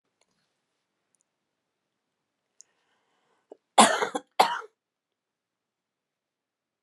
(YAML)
cough_length: 6.8 s
cough_amplitude: 25367
cough_signal_mean_std_ratio: 0.18
survey_phase: beta (2021-08-13 to 2022-03-07)
age: 65+
gender: Female
wearing_mask: 'No'
symptom_abdominal_pain: true
symptom_fatigue: true
symptom_onset: 12 days
smoker_status: Current smoker (1 to 10 cigarettes per day)
respiratory_condition_asthma: false
respiratory_condition_other: false
recruitment_source: REACT
submission_delay: 3 days
covid_test_result: Negative
covid_test_method: RT-qPCR